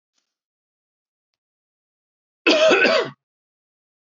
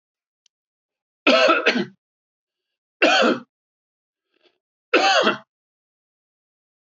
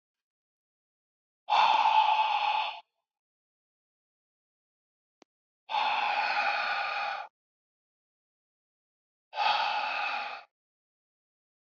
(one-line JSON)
{"cough_length": "4.1 s", "cough_amplitude": 23570, "cough_signal_mean_std_ratio": 0.32, "three_cough_length": "6.8 s", "three_cough_amplitude": 24702, "three_cough_signal_mean_std_ratio": 0.36, "exhalation_length": "11.7 s", "exhalation_amplitude": 9049, "exhalation_signal_mean_std_ratio": 0.46, "survey_phase": "beta (2021-08-13 to 2022-03-07)", "age": "45-64", "gender": "Male", "wearing_mask": "No", "symptom_none": true, "smoker_status": "Never smoked", "respiratory_condition_asthma": false, "respiratory_condition_other": false, "recruitment_source": "REACT", "submission_delay": "2 days", "covid_test_result": "Negative", "covid_test_method": "RT-qPCR", "influenza_a_test_result": "Negative", "influenza_b_test_result": "Negative"}